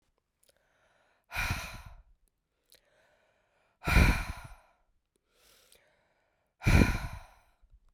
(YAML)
exhalation_length: 7.9 s
exhalation_amplitude: 14718
exhalation_signal_mean_std_ratio: 0.28
survey_phase: beta (2021-08-13 to 2022-03-07)
age: 45-64
gender: Female
wearing_mask: 'No'
symptom_cough_any: true
symptom_runny_or_blocked_nose: true
symptom_shortness_of_breath: true
symptom_sore_throat: true
symptom_abdominal_pain: true
symptom_fatigue: true
symptom_headache: true
symptom_change_to_sense_of_smell_or_taste: true
symptom_other: true
symptom_onset: 4 days
smoker_status: Ex-smoker
respiratory_condition_asthma: false
respiratory_condition_other: false
recruitment_source: Test and Trace
submission_delay: 2 days
covid_test_result: Positive
covid_test_method: RT-qPCR
covid_ct_value: 18.3
covid_ct_gene: ORF1ab gene
covid_ct_mean: 18.8
covid_viral_load: 680000 copies/ml
covid_viral_load_category: Low viral load (10K-1M copies/ml)